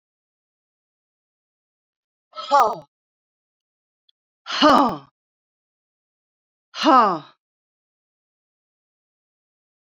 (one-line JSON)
{"exhalation_length": "10.0 s", "exhalation_amplitude": 28243, "exhalation_signal_mean_std_ratio": 0.24, "survey_phase": "beta (2021-08-13 to 2022-03-07)", "age": "65+", "gender": "Male", "wearing_mask": "No", "symptom_fatigue": true, "symptom_headache": true, "symptom_change_to_sense_of_smell_or_taste": true, "symptom_loss_of_taste": true, "symptom_onset": "3 days", "smoker_status": "Never smoked", "respiratory_condition_asthma": false, "respiratory_condition_other": false, "recruitment_source": "Test and Trace", "submission_delay": "1 day", "covid_test_result": "Positive", "covid_test_method": "RT-qPCR", "covid_ct_value": 17.0, "covid_ct_gene": "ORF1ab gene", "covid_ct_mean": 18.0, "covid_viral_load": "1200000 copies/ml", "covid_viral_load_category": "High viral load (>1M copies/ml)"}